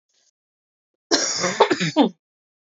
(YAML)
cough_length: 2.6 s
cough_amplitude: 26998
cough_signal_mean_std_ratio: 0.42
survey_phase: beta (2021-08-13 to 2022-03-07)
age: 18-44
gender: Female
wearing_mask: 'No'
symptom_cough_any: true
symptom_runny_or_blocked_nose: true
symptom_sore_throat: true
symptom_fatigue: true
symptom_headache: true
smoker_status: Ex-smoker
respiratory_condition_asthma: false
respiratory_condition_other: false
recruitment_source: Test and Trace
submission_delay: 2 days
covid_test_result: Positive
covid_test_method: RT-qPCR
covid_ct_value: 19.5
covid_ct_gene: ORF1ab gene
covid_ct_mean: 19.7
covid_viral_load: 340000 copies/ml
covid_viral_load_category: Low viral load (10K-1M copies/ml)